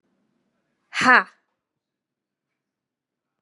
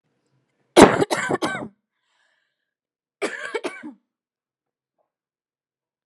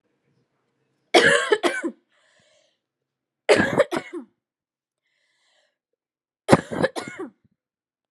{
  "exhalation_length": "3.4 s",
  "exhalation_amplitude": 30887,
  "exhalation_signal_mean_std_ratio": 0.19,
  "cough_length": "6.1 s",
  "cough_amplitude": 32768,
  "cough_signal_mean_std_ratio": 0.23,
  "three_cough_length": "8.1 s",
  "three_cough_amplitude": 32768,
  "three_cough_signal_mean_std_ratio": 0.3,
  "survey_phase": "alpha (2021-03-01 to 2021-08-12)",
  "age": "18-44",
  "gender": "Female",
  "wearing_mask": "No",
  "symptom_cough_any": true,
  "symptom_new_continuous_cough": true,
  "symptom_fatigue": true,
  "symptom_headache": true,
  "symptom_change_to_sense_of_smell_or_taste": true,
  "symptom_onset": "6 days",
  "smoker_status": "Never smoked",
  "respiratory_condition_asthma": false,
  "respiratory_condition_other": false,
  "recruitment_source": "Test and Trace",
  "submission_delay": "1 day",
  "covid_test_result": "Positive",
  "covid_test_method": "RT-qPCR",
  "covid_ct_value": 16.4,
  "covid_ct_gene": "ORF1ab gene",
  "covid_ct_mean": 17.3,
  "covid_viral_load": "2200000 copies/ml",
  "covid_viral_load_category": "High viral load (>1M copies/ml)"
}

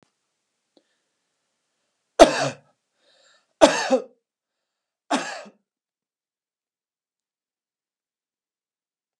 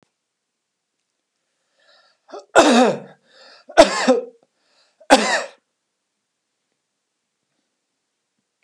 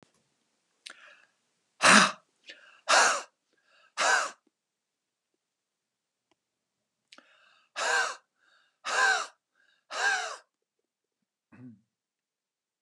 {
  "cough_length": "9.2 s",
  "cough_amplitude": 32768,
  "cough_signal_mean_std_ratio": 0.18,
  "three_cough_length": "8.6 s",
  "three_cough_amplitude": 32768,
  "three_cough_signal_mean_std_ratio": 0.27,
  "exhalation_length": "12.8 s",
  "exhalation_amplitude": 22953,
  "exhalation_signal_mean_std_ratio": 0.29,
  "survey_phase": "beta (2021-08-13 to 2022-03-07)",
  "age": "65+",
  "gender": "Male",
  "wearing_mask": "No",
  "symptom_none": true,
  "smoker_status": "Never smoked",
  "respiratory_condition_asthma": false,
  "respiratory_condition_other": false,
  "recruitment_source": "REACT",
  "submission_delay": "2 days",
  "covid_test_result": "Negative",
  "covid_test_method": "RT-qPCR"
}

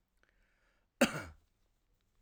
{
  "cough_length": "2.2 s",
  "cough_amplitude": 6537,
  "cough_signal_mean_std_ratio": 0.19,
  "survey_phase": "alpha (2021-03-01 to 2021-08-12)",
  "age": "45-64",
  "gender": "Male",
  "wearing_mask": "No",
  "symptom_none": true,
  "smoker_status": "Never smoked",
  "respiratory_condition_asthma": false,
  "respiratory_condition_other": false,
  "recruitment_source": "REACT",
  "submission_delay": "2 days",
  "covid_test_result": "Negative",
  "covid_test_method": "RT-qPCR"
}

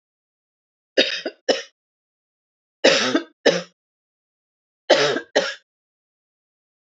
{
  "cough_length": "6.8 s",
  "cough_amplitude": 27468,
  "cough_signal_mean_std_ratio": 0.32,
  "survey_phase": "alpha (2021-03-01 to 2021-08-12)",
  "age": "45-64",
  "gender": "Female",
  "wearing_mask": "No",
  "symptom_none": true,
  "smoker_status": "Ex-smoker",
  "respiratory_condition_asthma": false,
  "respiratory_condition_other": false,
  "recruitment_source": "REACT",
  "submission_delay": "1 day",
  "covid_test_result": "Negative",
  "covid_test_method": "RT-qPCR"
}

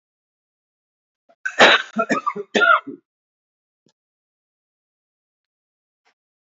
{
  "cough_length": "6.5 s",
  "cough_amplitude": 28121,
  "cough_signal_mean_std_ratio": 0.26,
  "survey_phase": "beta (2021-08-13 to 2022-03-07)",
  "age": "45-64",
  "gender": "Male",
  "wearing_mask": "No",
  "symptom_cough_any": true,
  "symptom_runny_or_blocked_nose": true,
  "symptom_sore_throat": true,
  "symptom_change_to_sense_of_smell_or_taste": true,
  "symptom_onset": "5 days",
  "smoker_status": "Never smoked",
  "respiratory_condition_asthma": false,
  "respiratory_condition_other": false,
  "recruitment_source": "Test and Trace",
  "submission_delay": "2 days",
  "covid_test_result": "Positive",
  "covid_test_method": "RT-qPCR",
  "covid_ct_value": 20.6,
  "covid_ct_gene": "N gene",
  "covid_ct_mean": 21.6,
  "covid_viral_load": "85000 copies/ml",
  "covid_viral_load_category": "Low viral load (10K-1M copies/ml)"
}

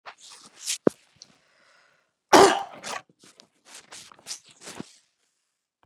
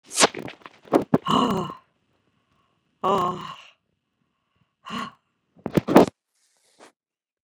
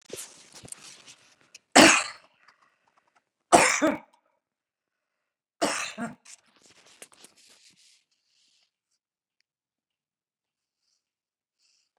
{
  "cough_length": "5.9 s",
  "cough_amplitude": 30607,
  "cough_signal_mean_std_ratio": 0.21,
  "exhalation_length": "7.4 s",
  "exhalation_amplitude": 32766,
  "exhalation_signal_mean_std_ratio": 0.3,
  "three_cough_length": "12.0 s",
  "three_cough_amplitude": 28980,
  "three_cough_signal_mean_std_ratio": 0.2,
  "survey_phase": "beta (2021-08-13 to 2022-03-07)",
  "age": "65+",
  "gender": "Female",
  "wearing_mask": "No",
  "symptom_none": true,
  "smoker_status": "Ex-smoker",
  "respiratory_condition_asthma": false,
  "respiratory_condition_other": false,
  "recruitment_source": "REACT",
  "submission_delay": "2 days",
  "covid_test_result": "Negative",
  "covid_test_method": "RT-qPCR",
  "influenza_a_test_result": "Negative",
  "influenza_b_test_result": "Negative"
}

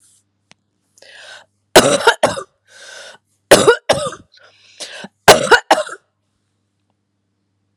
{
  "three_cough_length": "7.8 s",
  "three_cough_amplitude": 32768,
  "three_cough_signal_mean_std_ratio": 0.31,
  "survey_phase": "alpha (2021-03-01 to 2021-08-12)",
  "age": "45-64",
  "gender": "Female",
  "wearing_mask": "No",
  "symptom_cough_any": true,
  "symptom_headache": true,
  "symptom_change_to_sense_of_smell_or_taste": true,
  "symptom_onset": "6 days",
  "smoker_status": "Prefer not to say",
  "respiratory_condition_asthma": false,
  "respiratory_condition_other": false,
  "recruitment_source": "Test and Trace",
  "submission_delay": "1 day",
  "covid_test_result": "Positive",
  "covid_test_method": "RT-qPCR"
}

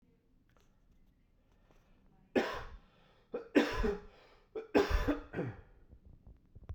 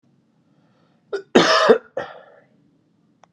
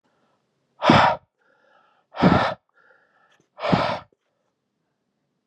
{
  "three_cough_length": "6.7 s",
  "three_cough_amplitude": 7438,
  "three_cough_signal_mean_std_ratio": 0.38,
  "cough_length": "3.3 s",
  "cough_amplitude": 32767,
  "cough_signal_mean_std_ratio": 0.31,
  "exhalation_length": "5.5 s",
  "exhalation_amplitude": 30165,
  "exhalation_signal_mean_std_ratio": 0.33,
  "survey_phase": "beta (2021-08-13 to 2022-03-07)",
  "age": "45-64",
  "gender": "Male",
  "wearing_mask": "No",
  "symptom_cough_any": true,
  "symptom_runny_or_blocked_nose": true,
  "symptom_fatigue": true,
  "symptom_headache": true,
  "symptom_change_to_sense_of_smell_or_taste": true,
  "symptom_loss_of_taste": true,
  "symptom_onset": "3 days",
  "smoker_status": "Ex-smoker",
  "respiratory_condition_asthma": false,
  "respiratory_condition_other": false,
  "recruitment_source": "Test and Trace",
  "submission_delay": "2 days",
  "covid_test_result": "Positive",
  "covid_test_method": "RT-qPCR",
  "covid_ct_value": 21.2,
  "covid_ct_gene": "ORF1ab gene"
}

